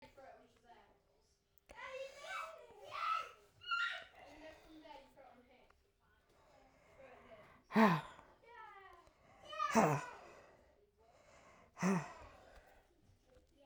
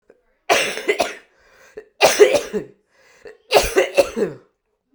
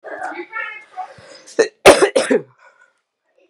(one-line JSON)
{"exhalation_length": "13.7 s", "exhalation_amplitude": 5315, "exhalation_signal_mean_std_ratio": 0.34, "three_cough_length": "4.9 s", "three_cough_amplitude": 32768, "three_cough_signal_mean_std_ratio": 0.42, "cough_length": "3.5 s", "cough_amplitude": 32768, "cough_signal_mean_std_ratio": 0.34, "survey_phase": "beta (2021-08-13 to 2022-03-07)", "age": "18-44", "gender": "Female", "wearing_mask": "No", "symptom_cough_any": true, "symptom_runny_or_blocked_nose": true, "symptom_shortness_of_breath": true, "symptom_sore_throat": true, "symptom_fatigue": true, "symptom_fever_high_temperature": true, "symptom_headache": true, "symptom_change_to_sense_of_smell_or_taste": true, "symptom_onset": "4 days", "smoker_status": "Never smoked", "respiratory_condition_asthma": false, "respiratory_condition_other": false, "recruitment_source": "Test and Trace", "submission_delay": "2 days", "covid_test_result": "Positive", "covid_test_method": "RT-qPCR"}